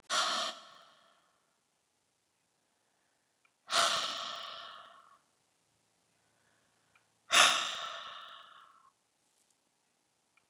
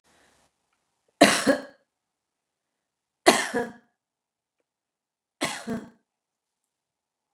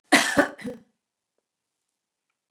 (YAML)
exhalation_length: 10.5 s
exhalation_amplitude: 10726
exhalation_signal_mean_std_ratio: 0.3
three_cough_length: 7.3 s
three_cough_amplitude: 29133
three_cough_signal_mean_std_ratio: 0.23
cough_length: 2.5 s
cough_amplitude: 24887
cough_signal_mean_std_ratio: 0.28
survey_phase: beta (2021-08-13 to 2022-03-07)
age: 65+
gender: Female
wearing_mask: 'No'
symptom_fatigue: true
symptom_onset: 12 days
smoker_status: Never smoked
respiratory_condition_asthma: false
respiratory_condition_other: false
recruitment_source: REACT
submission_delay: 1 day
covid_test_result: Positive
covid_test_method: RT-qPCR
covid_ct_value: 22.0
covid_ct_gene: E gene
influenza_a_test_result: Negative
influenza_b_test_result: Negative